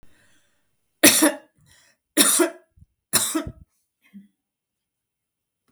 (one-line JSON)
{"three_cough_length": "5.7 s", "three_cough_amplitude": 32768, "three_cough_signal_mean_std_ratio": 0.3, "survey_phase": "beta (2021-08-13 to 2022-03-07)", "age": "65+", "gender": "Female", "wearing_mask": "No", "symptom_runny_or_blocked_nose": true, "smoker_status": "Never smoked", "respiratory_condition_asthma": false, "respiratory_condition_other": false, "recruitment_source": "REACT", "submission_delay": "2 days", "covid_test_result": "Negative", "covid_test_method": "RT-qPCR", "influenza_a_test_result": "Negative", "influenza_b_test_result": "Negative"}